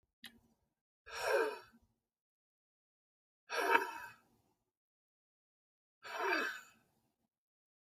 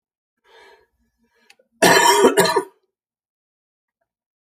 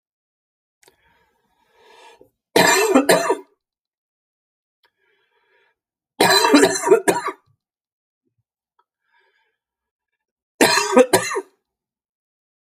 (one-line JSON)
{"exhalation_length": "7.9 s", "exhalation_amplitude": 6665, "exhalation_signal_mean_std_ratio": 0.32, "cough_length": "4.4 s", "cough_amplitude": 32408, "cough_signal_mean_std_ratio": 0.33, "three_cough_length": "12.6 s", "three_cough_amplitude": 32768, "three_cough_signal_mean_std_ratio": 0.33, "survey_phase": "beta (2021-08-13 to 2022-03-07)", "age": "45-64", "gender": "Male", "wearing_mask": "No", "symptom_cough_any": true, "symptom_runny_or_blocked_nose": true, "symptom_shortness_of_breath": true, "symptom_sore_throat": true, "symptom_abdominal_pain": true, "symptom_fatigue": true, "symptom_fever_high_temperature": true, "symptom_headache": true, "symptom_change_to_sense_of_smell_or_taste": true, "symptom_loss_of_taste": true, "symptom_onset": "3 days", "smoker_status": "Never smoked", "respiratory_condition_asthma": false, "respiratory_condition_other": false, "recruitment_source": "Test and Trace", "submission_delay": "2 days", "covid_test_result": "Positive", "covid_test_method": "RT-qPCR", "covid_ct_value": 26.8, "covid_ct_gene": "ORF1ab gene"}